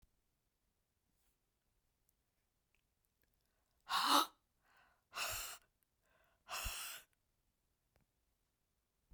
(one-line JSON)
{"exhalation_length": "9.1 s", "exhalation_amplitude": 4717, "exhalation_signal_mean_std_ratio": 0.25, "survey_phase": "beta (2021-08-13 to 2022-03-07)", "age": "65+", "gender": "Female", "wearing_mask": "No", "symptom_runny_or_blocked_nose": true, "symptom_fatigue": true, "symptom_headache": true, "symptom_change_to_sense_of_smell_or_taste": true, "symptom_loss_of_taste": true, "symptom_onset": "4 days", "smoker_status": "Never smoked", "respiratory_condition_asthma": false, "respiratory_condition_other": false, "recruitment_source": "Test and Trace", "submission_delay": "2 days", "covid_test_result": "Positive", "covid_test_method": "ePCR"}